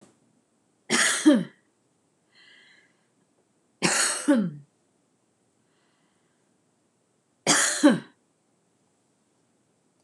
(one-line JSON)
{"three_cough_length": "10.0 s", "three_cough_amplitude": 17384, "three_cough_signal_mean_std_ratio": 0.31, "survey_phase": "beta (2021-08-13 to 2022-03-07)", "age": "65+", "gender": "Female", "wearing_mask": "No", "symptom_none": true, "smoker_status": "Never smoked", "respiratory_condition_asthma": false, "respiratory_condition_other": false, "recruitment_source": "REACT", "submission_delay": "3 days", "covid_test_result": "Negative", "covid_test_method": "RT-qPCR", "influenza_a_test_result": "Negative", "influenza_b_test_result": "Negative"}